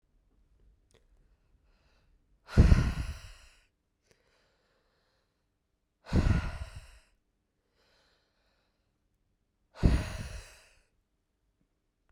exhalation_length: 12.1 s
exhalation_amplitude: 15139
exhalation_signal_mean_std_ratio: 0.24
survey_phase: beta (2021-08-13 to 2022-03-07)
age: 18-44
gender: Male
wearing_mask: 'No'
symptom_cough_any: true
symptom_runny_or_blocked_nose: true
symptom_onset: 5 days
smoker_status: Never smoked
respiratory_condition_asthma: false
respiratory_condition_other: false
recruitment_source: REACT
submission_delay: 1 day
covid_test_result: Negative
covid_test_method: RT-qPCR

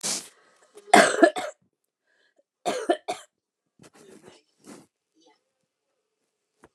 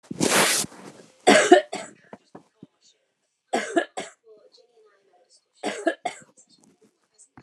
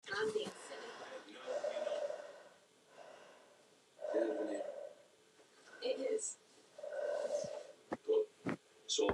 cough_length: 6.7 s
cough_amplitude: 28810
cough_signal_mean_std_ratio: 0.24
three_cough_length: 7.4 s
three_cough_amplitude: 28952
three_cough_signal_mean_std_ratio: 0.31
exhalation_length: 9.1 s
exhalation_amplitude: 2953
exhalation_signal_mean_std_ratio: 0.62
survey_phase: alpha (2021-03-01 to 2021-08-12)
age: 45-64
gender: Female
wearing_mask: 'No'
symptom_none: true
smoker_status: Current smoker (1 to 10 cigarettes per day)
respiratory_condition_asthma: false
respiratory_condition_other: false
recruitment_source: REACT
submission_delay: 1 day
covid_test_result: Negative
covid_test_method: RT-qPCR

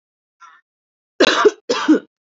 cough_length: 2.2 s
cough_amplitude: 31179
cough_signal_mean_std_ratio: 0.39
survey_phase: beta (2021-08-13 to 2022-03-07)
age: 18-44
gender: Female
wearing_mask: 'No'
symptom_none: true
smoker_status: Never smoked
respiratory_condition_asthma: false
respiratory_condition_other: false
recruitment_source: REACT
submission_delay: 4 days
covid_test_result: Negative
covid_test_method: RT-qPCR
influenza_a_test_result: Negative
influenza_b_test_result: Negative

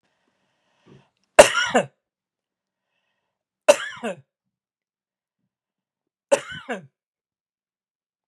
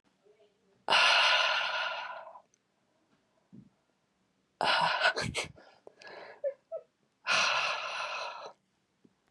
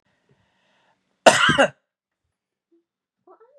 three_cough_length: 8.3 s
three_cough_amplitude: 32768
three_cough_signal_mean_std_ratio: 0.18
exhalation_length: 9.3 s
exhalation_amplitude: 8145
exhalation_signal_mean_std_ratio: 0.48
cough_length: 3.6 s
cough_amplitude: 32768
cough_signal_mean_std_ratio: 0.24
survey_phase: beta (2021-08-13 to 2022-03-07)
age: 18-44
gender: Male
wearing_mask: 'No'
symptom_none: true
smoker_status: Never smoked
respiratory_condition_asthma: false
respiratory_condition_other: false
recruitment_source: REACT
submission_delay: 2 days
covid_test_result: Negative
covid_test_method: RT-qPCR
influenza_a_test_result: Negative
influenza_b_test_result: Negative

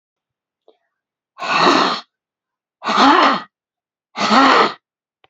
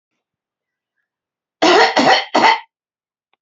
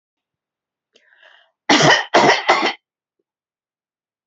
exhalation_length: 5.3 s
exhalation_amplitude: 30240
exhalation_signal_mean_std_ratio: 0.46
three_cough_length: 3.4 s
three_cough_amplitude: 30495
three_cough_signal_mean_std_ratio: 0.41
cough_length: 4.3 s
cough_amplitude: 29193
cough_signal_mean_std_ratio: 0.36
survey_phase: alpha (2021-03-01 to 2021-08-12)
age: 65+
gender: Female
wearing_mask: 'No'
symptom_none: true
smoker_status: Ex-smoker
respiratory_condition_asthma: false
respiratory_condition_other: false
recruitment_source: REACT
submission_delay: 1 day
covid_test_result: Negative
covid_test_method: RT-qPCR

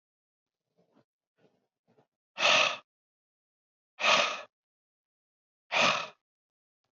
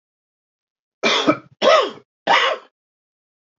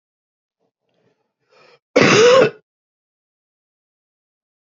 exhalation_length: 6.9 s
exhalation_amplitude: 10420
exhalation_signal_mean_std_ratio: 0.3
three_cough_length: 3.6 s
three_cough_amplitude: 26766
three_cough_signal_mean_std_ratio: 0.4
cough_length: 4.8 s
cough_amplitude: 30162
cough_signal_mean_std_ratio: 0.28
survey_phase: alpha (2021-03-01 to 2021-08-12)
age: 45-64
gender: Male
wearing_mask: 'No'
symptom_cough_any: true
symptom_fatigue: true
symptom_onset: 3 days
smoker_status: Ex-smoker
respiratory_condition_asthma: false
respiratory_condition_other: false
recruitment_source: Test and Trace
submission_delay: 2 days
covid_test_result: Positive
covid_test_method: RT-qPCR
covid_ct_value: 16.5
covid_ct_gene: ORF1ab gene
covid_ct_mean: 16.9
covid_viral_load: 3000000 copies/ml
covid_viral_load_category: High viral load (>1M copies/ml)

